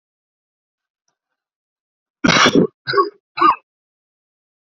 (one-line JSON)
{"cough_length": "4.8 s", "cough_amplitude": 31689, "cough_signal_mean_std_ratio": 0.31, "survey_phase": "beta (2021-08-13 to 2022-03-07)", "age": "18-44", "gender": "Male", "wearing_mask": "No", "symptom_sore_throat": true, "symptom_headache": true, "smoker_status": "Never smoked", "respiratory_condition_asthma": false, "respiratory_condition_other": false, "recruitment_source": "Test and Trace", "submission_delay": "1 day", "covid_test_result": "Positive", "covid_test_method": "RT-qPCR", "covid_ct_value": 13.7, "covid_ct_gene": "ORF1ab gene"}